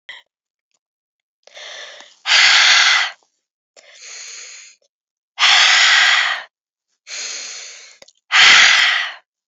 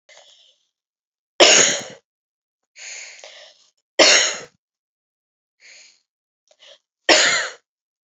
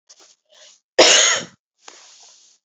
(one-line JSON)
{"exhalation_length": "9.5 s", "exhalation_amplitude": 32767, "exhalation_signal_mean_std_ratio": 0.47, "three_cough_length": "8.1 s", "three_cough_amplitude": 31977, "three_cough_signal_mean_std_ratio": 0.3, "cough_length": "2.6 s", "cough_amplitude": 32768, "cough_signal_mean_std_ratio": 0.33, "survey_phase": "beta (2021-08-13 to 2022-03-07)", "age": "18-44", "gender": "Female", "wearing_mask": "No", "symptom_cough_any": true, "symptom_new_continuous_cough": true, "symptom_runny_or_blocked_nose": true, "symptom_shortness_of_breath": true, "symptom_fatigue": true, "symptom_onset": "4 days", "smoker_status": "Never smoked", "respiratory_condition_asthma": false, "respiratory_condition_other": false, "recruitment_source": "Test and Trace", "submission_delay": "2 days", "covid_test_result": "Positive", "covid_test_method": "RT-qPCR", "covid_ct_value": 24.8, "covid_ct_gene": "ORF1ab gene"}